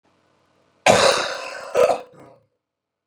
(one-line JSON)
{"cough_length": "3.1 s", "cough_amplitude": 31303, "cough_signal_mean_std_ratio": 0.39, "survey_phase": "beta (2021-08-13 to 2022-03-07)", "age": "45-64", "gender": "Male", "wearing_mask": "No", "symptom_none": true, "smoker_status": "Ex-smoker", "respiratory_condition_asthma": false, "respiratory_condition_other": false, "recruitment_source": "REACT", "submission_delay": "1 day", "covid_test_result": "Negative", "covid_test_method": "RT-qPCR", "influenza_a_test_result": "Negative", "influenza_b_test_result": "Negative"}